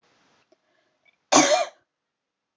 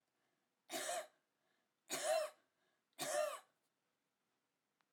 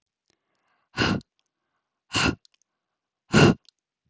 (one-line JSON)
{"cough_length": "2.6 s", "cough_amplitude": 22728, "cough_signal_mean_std_ratio": 0.28, "three_cough_length": "4.9 s", "three_cough_amplitude": 1399, "three_cough_signal_mean_std_ratio": 0.39, "exhalation_length": "4.1 s", "exhalation_amplitude": 22352, "exhalation_signal_mean_std_ratio": 0.29, "survey_phase": "alpha (2021-03-01 to 2021-08-12)", "age": "18-44", "gender": "Female", "wearing_mask": "No", "symptom_none": true, "smoker_status": "Never smoked", "respiratory_condition_asthma": false, "respiratory_condition_other": false, "recruitment_source": "REACT", "submission_delay": "1 day", "covid_test_result": "Negative", "covid_test_method": "RT-qPCR"}